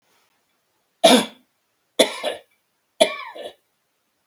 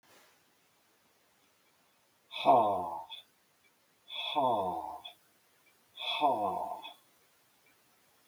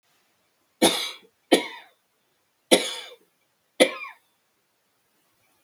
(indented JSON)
{
  "three_cough_length": "4.3 s",
  "three_cough_amplitude": 32766,
  "three_cough_signal_mean_std_ratio": 0.27,
  "exhalation_length": "8.3 s",
  "exhalation_amplitude": 7027,
  "exhalation_signal_mean_std_ratio": 0.4,
  "cough_length": "5.6 s",
  "cough_amplitude": 29404,
  "cough_signal_mean_std_ratio": 0.25,
  "survey_phase": "beta (2021-08-13 to 2022-03-07)",
  "age": "65+",
  "gender": "Male",
  "wearing_mask": "No",
  "symptom_none": true,
  "symptom_onset": "5 days",
  "smoker_status": "Never smoked",
  "respiratory_condition_asthma": false,
  "respiratory_condition_other": false,
  "recruitment_source": "REACT",
  "submission_delay": "0 days",
  "covid_test_result": "Negative",
  "covid_test_method": "RT-qPCR",
  "influenza_a_test_result": "Negative",
  "influenza_b_test_result": "Negative"
}